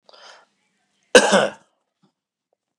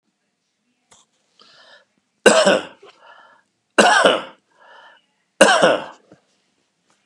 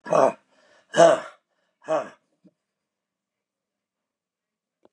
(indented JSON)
{
  "cough_length": "2.8 s",
  "cough_amplitude": 32768,
  "cough_signal_mean_std_ratio": 0.25,
  "three_cough_length": "7.1 s",
  "three_cough_amplitude": 32768,
  "three_cough_signal_mean_std_ratio": 0.33,
  "exhalation_length": "4.9 s",
  "exhalation_amplitude": 26627,
  "exhalation_signal_mean_std_ratio": 0.26,
  "survey_phase": "beta (2021-08-13 to 2022-03-07)",
  "age": "65+",
  "gender": "Male",
  "wearing_mask": "No",
  "symptom_none": true,
  "smoker_status": "Ex-smoker",
  "respiratory_condition_asthma": false,
  "respiratory_condition_other": false,
  "recruitment_source": "REACT",
  "submission_delay": "1 day",
  "covid_test_result": "Negative",
  "covid_test_method": "RT-qPCR",
  "influenza_a_test_result": "Negative",
  "influenza_b_test_result": "Negative"
}